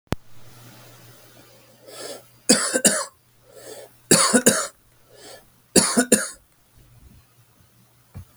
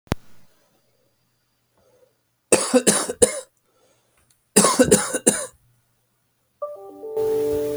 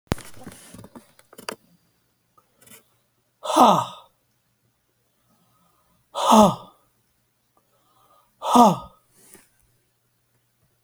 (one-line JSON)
{"three_cough_length": "8.4 s", "three_cough_amplitude": 32768, "three_cough_signal_mean_std_ratio": 0.34, "cough_length": "7.8 s", "cough_amplitude": 32768, "cough_signal_mean_std_ratio": 0.39, "exhalation_length": "10.8 s", "exhalation_amplitude": 28310, "exhalation_signal_mean_std_ratio": 0.25, "survey_phase": "alpha (2021-03-01 to 2021-08-12)", "age": "45-64", "gender": "Male", "wearing_mask": "No", "symptom_none": true, "smoker_status": "Never smoked", "respiratory_condition_asthma": false, "respiratory_condition_other": false, "recruitment_source": "REACT", "submission_delay": "2 days", "covid_test_result": "Negative", "covid_test_method": "RT-qPCR"}